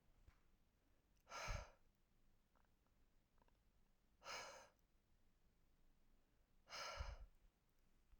{"exhalation_length": "8.2 s", "exhalation_amplitude": 455, "exhalation_signal_mean_std_ratio": 0.42, "survey_phase": "alpha (2021-03-01 to 2021-08-12)", "age": "45-64", "gender": "Female", "wearing_mask": "No", "symptom_none": true, "smoker_status": "Ex-smoker", "respiratory_condition_asthma": false, "respiratory_condition_other": false, "recruitment_source": "REACT", "submission_delay": "1 day", "covid_test_result": "Negative", "covid_test_method": "RT-qPCR"}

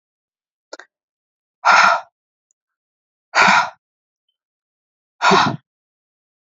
{"exhalation_length": "6.6 s", "exhalation_amplitude": 31963, "exhalation_signal_mean_std_ratio": 0.31, "survey_phase": "alpha (2021-03-01 to 2021-08-12)", "age": "18-44", "gender": "Female", "wearing_mask": "No", "symptom_none": true, "smoker_status": "Never smoked", "respiratory_condition_asthma": false, "respiratory_condition_other": false, "recruitment_source": "REACT", "submission_delay": "1 day", "covid_test_result": "Negative", "covid_test_method": "RT-qPCR"}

